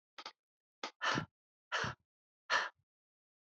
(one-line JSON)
{"exhalation_length": "3.5 s", "exhalation_amplitude": 3429, "exhalation_signal_mean_std_ratio": 0.35, "survey_phase": "alpha (2021-03-01 to 2021-08-12)", "age": "45-64", "gender": "Female", "wearing_mask": "No", "symptom_fatigue": true, "symptom_change_to_sense_of_smell_or_taste": true, "symptom_onset": "6 days", "smoker_status": "Never smoked", "respiratory_condition_asthma": false, "respiratory_condition_other": false, "recruitment_source": "Test and Trace", "submission_delay": "2 days", "covid_test_result": "Positive", "covid_test_method": "ePCR"}